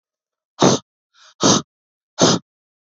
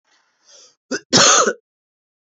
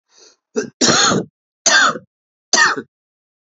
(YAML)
exhalation_length: 2.9 s
exhalation_amplitude: 32630
exhalation_signal_mean_std_ratio: 0.35
cough_length: 2.2 s
cough_amplitude: 32661
cough_signal_mean_std_ratio: 0.37
three_cough_length: 3.5 s
three_cough_amplitude: 31324
three_cough_signal_mean_std_ratio: 0.46
survey_phase: beta (2021-08-13 to 2022-03-07)
age: 18-44
gender: Male
wearing_mask: 'Yes'
symptom_runny_or_blocked_nose: true
symptom_fever_high_temperature: true
symptom_headache: true
symptom_onset: 5 days
smoker_status: Current smoker (e-cigarettes or vapes only)
respiratory_condition_asthma: false
respiratory_condition_other: false
recruitment_source: Test and Trace
submission_delay: 2 days
covid_test_result: Positive
covid_test_method: RT-qPCR
covid_ct_value: 15.5
covid_ct_gene: N gene